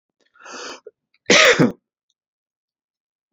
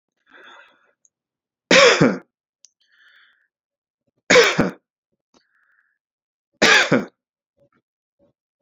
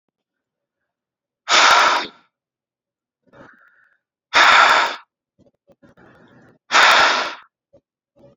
{"cough_length": "3.3 s", "cough_amplitude": 30409, "cough_signal_mean_std_ratio": 0.29, "three_cough_length": "8.6 s", "three_cough_amplitude": 29641, "three_cough_signal_mean_std_ratio": 0.29, "exhalation_length": "8.4 s", "exhalation_amplitude": 30537, "exhalation_signal_mean_std_ratio": 0.37, "survey_phase": "alpha (2021-03-01 to 2021-08-12)", "age": "18-44", "gender": "Male", "wearing_mask": "No", "symptom_none": true, "smoker_status": "Ex-smoker", "respiratory_condition_asthma": false, "respiratory_condition_other": false, "recruitment_source": "Test and Trace", "submission_delay": "-1 day", "covid_test_result": "Negative", "covid_test_method": "LFT"}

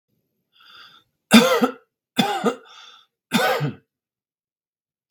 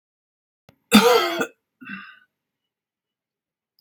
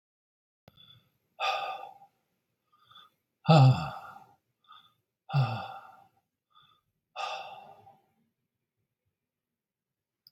{"three_cough_length": "5.1 s", "three_cough_amplitude": 32768, "three_cough_signal_mean_std_ratio": 0.34, "cough_length": "3.8 s", "cough_amplitude": 32749, "cough_signal_mean_std_ratio": 0.28, "exhalation_length": "10.3 s", "exhalation_amplitude": 13066, "exhalation_signal_mean_std_ratio": 0.25, "survey_phase": "beta (2021-08-13 to 2022-03-07)", "age": "65+", "gender": "Male", "wearing_mask": "No", "symptom_none": true, "smoker_status": "Ex-smoker", "respiratory_condition_asthma": false, "respiratory_condition_other": false, "recruitment_source": "REACT", "submission_delay": "2 days", "covid_test_result": "Negative", "covid_test_method": "RT-qPCR", "influenza_a_test_result": "Negative", "influenza_b_test_result": "Negative"}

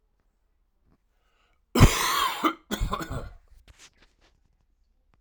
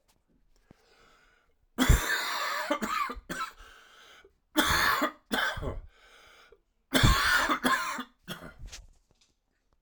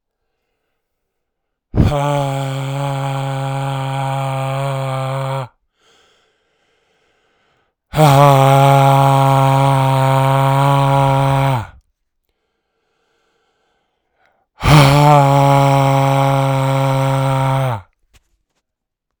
{"cough_length": "5.2 s", "cough_amplitude": 29663, "cough_signal_mean_std_ratio": 0.31, "three_cough_length": "9.8 s", "three_cough_amplitude": 13780, "three_cough_signal_mean_std_ratio": 0.48, "exhalation_length": "19.2 s", "exhalation_amplitude": 32768, "exhalation_signal_mean_std_ratio": 0.66, "survey_phase": "alpha (2021-03-01 to 2021-08-12)", "age": "45-64", "gender": "Female", "wearing_mask": "No", "symptom_cough_any": true, "symptom_abdominal_pain": true, "symptom_fatigue": true, "symptom_fever_high_temperature": true, "smoker_status": "Ex-smoker", "respiratory_condition_asthma": false, "respiratory_condition_other": false, "recruitment_source": "Test and Trace", "submission_delay": "2 days", "covid_test_result": "Positive", "covid_test_method": "RT-qPCR", "covid_ct_value": 31.1, "covid_ct_gene": "ORF1ab gene"}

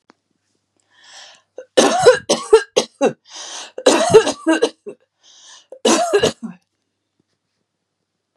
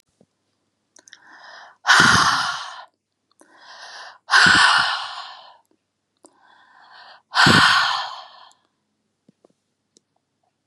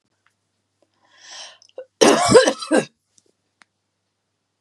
{"three_cough_length": "8.4 s", "three_cough_amplitude": 32768, "three_cough_signal_mean_std_ratio": 0.38, "exhalation_length": "10.7 s", "exhalation_amplitude": 31540, "exhalation_signal_mean_std_ratio": 0.38, "cough_length": "4.6 s", "cough_amplitude": 32744, "cough_signal_mean_std_ratio": 0.3, "survey_phase": "beta (2021-08-13 to 2022-03-07)", "age": "45-64", "gender": "Female", "wearing_mask": "No", "symptom_none": true, "smoker_status": "Never smoked", "respiratory_condition_asthma": false, "respiratory_condition_other": false, "recruitment_source": "REACT", "submission_delay": "3 days", "covid_test_result": "Negative", "covid_test_method": "RT-qPCR", "influenza_a_test_result": "Negative", "influenza_b_test_result": "Negative"}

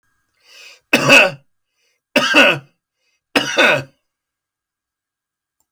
{"three_cough_length": "5.7 s", "three_cough_amplitude": 32203, "three_cough_signal_mean_std_ratio": 0.36, "survey_phase": "beta (2021-08-13 to 2022-03-07)", "age": "65+", "gender": "Male", "wearing_mask": "No", "symptom_none": true, "smoker_status": "Ex-smoker", "respiratory_condition_asthma": false, "respiratory_condition_other": false, "recruitment_source": "REACT", "submission_delay": "3 days", "covid_test_result": "Negative", "covid_test_method": "RT-qPCR"}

